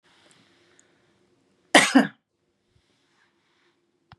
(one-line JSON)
{"cough_length": "4.2 s", "cough_amplitude": 32767, "cough_signal_mean_std_ratio": 0.19, "survey_phase": "beta (2021-08-13 to 2022-03-07)", "age": "45-64", "gender": "Female", "wearing_mask": "No", "symptom_none": true, "smoker_status": "Ex-smoker", "respiratory_condition_asthma": false, "respiratory_condition_other": false, "recruitment_source": "REACT", "submission_delay": "2 days", "covid_test_result": "Negative", "covid_test_method": "RT-qPCR", "influenza_a_test_result": "Negative", "influenza_b_test_result": "Negative"}